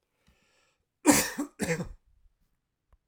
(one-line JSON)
{"cough_length": "3.1 s", "cough_amplitude": 15526, "cough_signal_mean_std_ratio": 0.3, "survey_phase": "alpha (2021-03-01 to 2021-08-12)", "age": "45-64", "gender": "Male", "wearing_mask": "No", "symptom_none": true, "smoker_status": "Never smoked", "respiratory_condition_asthma": false, "respiratory_condition_other": false, "recruitment_source": "REACT", "submission_delay": "1 day", "covid_test_result": "Negative", "covid_test_method": "RT-qPCR"}